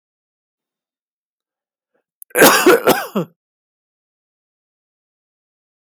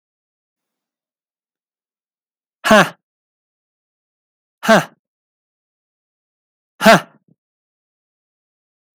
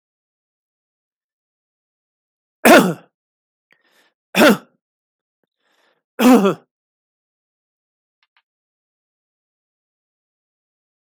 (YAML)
cough_length: 5.9 s
cough_amplitude: 32768
cough_signal_mean_std_ratio: 0.26
exhalation_length: 9.0 s
exhalation_amplitude: 32768
exhalation_signal_mean_std_ratio: 0.19
three_cough_length: 11.1 s
three_cough_amplitude: 32768
three_cough_signal_mean_std_ratio: 0.21
survey_phase: beta (2021-08-13 to 2022-03-07)
age: 65+
gender: Male
wearing_mask: 'No'
symptom_runny_or_blocked_nose: true
symptom_onset: 8 days
smoker_status: Never smoked
respiratory_condition_asthma: false
respiratory_condition_other: false
recruitment_source: REACT
submission_delay: 2 days
covid_test_result: Negative
covid_test_method: RT-qPCR
influenza_a_test_result: Negative
influenza_b_test_result: Negative